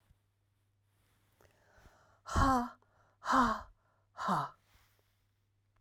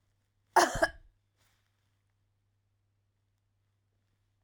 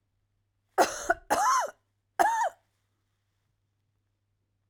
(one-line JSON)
{"exhalation_length": "5.8 s", "exhalation_amplitude": 5607, "exhalation_signal_mean_std_ratio": 0.34, "cough_length": "4.4 s", "cough_amplitude": 11584, "cough_signal_mean_std_ratio": 0.18, "three_cough_length": "4.7 s", "three_cough_amplitude": 12678, "three_cough_signal_mean_std_ratio": 0.36, "survey_phase": "beta (2021-08-13 to 2022-03-07)", "age": "45-64", "gender": "Female", "wearing_mask": "No", "symptom_cough_any": true, "symptom_shortness_of_breath": true, "symptom_sore_throat": true, "symptom_fatigue": true, "symptom_headache": true, "symptom_other": true, "smoker_status": "Never smoked", "respiratory_condition_asthma": false, "respiratory_condition_other": false, "recruitment_source": "Test and Trace", "submission_delay": "2 days", "covid_test_result": "Positive", "covid_test_method": "ePCR"}